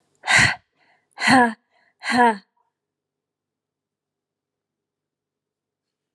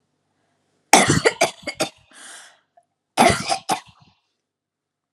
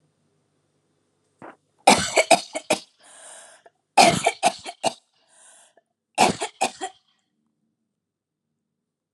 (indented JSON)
{
  "exhalation_length": "6.1 s",
  "exhalation_amplitude": 26919,
  "exhalation_signal_mean_std_ratio": 0.29,
  "cough_length": "5.1 s",
  "cough_amplitude": 32768,
  "cough_signal_mean_std_ratio": 0.32,
  "three_cough_length": "9.1 s",
  "three_cough_amplitude": 32213,
  "three_cough_signal_mean_std_ratio": 0.28,
  "survey_phase": "alpha (2021-03-01 to 2021-08-12)",
  "age": "45-64",
  "gender": "Female",
  "wearing_mask": "No",
  "symptom_fatigue": true,
  "symptom_onset": "7 days",
  "smoker_status": "Ex-smoker",
  "respiratory_condition_asthma": false,
  "respiratory_condition_other": false,
  "recruitment_source": "REACT",
  "submission_delay": "1 day",
  "covid_test_result": "Negative",
  "covid_test_method": "RT-qPCR"
}